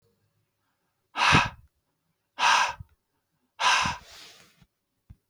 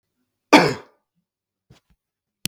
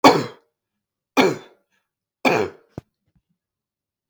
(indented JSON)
{
  "exhalation_length": "5.3 s",
  "exhalation_amplitude": 17038,
  "exhalation_signal_mean_std_ratio": 0.35,
  "cough_length": "2.5 s",
  "cough_amplitude": 32768,
  "cough_signal_mean_std_ratio": 0.21,
  "three_cough_length": "4.1 s",
  "three_cough_amplitude": 32768,
  "three_cough_signal_mean_std_ratio": 0.28,
  "survey_phase": "beta (2021-08-13 to 2022-03-07)",
  "age": "18-44",
  "gender": "Male",
  "wearing_mask": "No",
  "symptom_runny_or_blocked_nose": true,
  "symptom_fatigue": true,
  "smoker_status": "Never smoked",
  "respiratory_condition_asthma": false,
  "respiratory_condition_other": false,
  "recruitment_source": "Test and Trace",
  "submission_delay": "2 days",
  "covid_test_result": "Positive",
  "covid_test_method": "RT-qPCR",
  "covid_ct_value": 20.2,
  "covid_ct_gene": "ORF1ab gene",
  "covid_ct_mean": 20.7,
  "covid_viral_load": "160000 copies/ml",
  "covid_viral_load_category": "Low viral load (10K-1M copies/ml)"
}